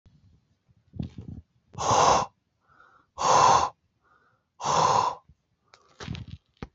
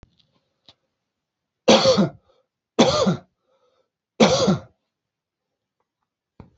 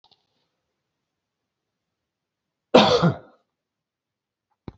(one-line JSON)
{"exhalation_length": "6.7 s", "exhalation_amplitude": 16505, "exhalation_signal_mean_std_ratio": 0.41, "three_cough_length": "6.6 s", "three_cough_amplitude": 29372, "three_cough_signal_mean_std_ratio": 0.33, "cough_length": "4.8 s", "cough_amplitude": 30115, "cough_signal_mean_std_ratio": 0.21, "survey_phase": "alpha (2021-03-01 to 2021-08-12)", "age": "18-44", "gender": "Male", "wearing_mask": "No", "symptom_none": true, "smoker_status": "Never smoked", "respiratory_condition_asthma": false, "respiratory_condition_other": false, "recruitment_source": "REACT", "submission_delay": "15 days", "covid_test_method": "RT-qPCR"}